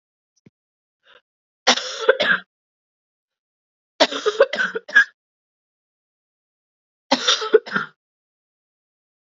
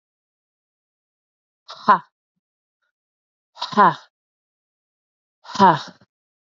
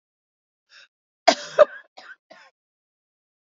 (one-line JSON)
{"three_cough_length": "9.4 s", "three_cough_amplitude": 30385, "three_cough_signal_mean_std_ratio": 0.29, "exhalation_length": "6.6 s", "exhalation_amplitude": 31604, "exhalation_signal_mean_std_ratio": 0.22, "cough_length": "3.6 s", "cough_amplitude": 28388, "cough_signal_mean_std_ratio": 0.17, "survey_phase": "alpha (2021-03-01 to 2021-08-12)", "age": "18-44", "gender": "Female", "wearing_mask": "No", "symptom_cough_any": true, "symptom_shortness_of_breath": true, "symptom_headache": true, "symptom_change_to_sense_of_smell_or_taste": true, "symptom_onset": "2 days", "smoker_status": "Ex-smoker", "respiratory_condition_asthma": false, "respiratory_condition_other": false, "recruitment_source": "Test and Trace", "submission_delay": "1 day", "covid_test_result": "Positive", "covid_test_method": "RT-qPCR", "covid_ct_value": 19.8, "covid_ct_gene": "ORF1ab gene", "covid_ct_mean": 20.2, "covid_viral_load": "240000 copies/ml", "covid_viral_load_category": "Low viral load (10K-1M copies/ml)"}